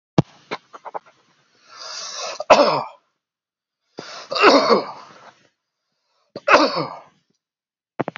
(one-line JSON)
{"three_cough_length": "8.2 s", "three_cough_amplitude": 32768, "three_cough_signal_mean_std_ratio": 0.33, "survey_phase": "beta (2021-08-13 to 2022-03-07)", "age": "65+", "gender": "Male", "wearing_mask": "No", "symptom_none": true, "smoker_status": "Never smoked", "respiratory_condition_asthma": true, "respiratory_condition_other": false, "recruitment_source": "REACT", "submission_delay": "2 days", "covid_test_result": "Negative", "covid_test_method": "RT-qPCR"}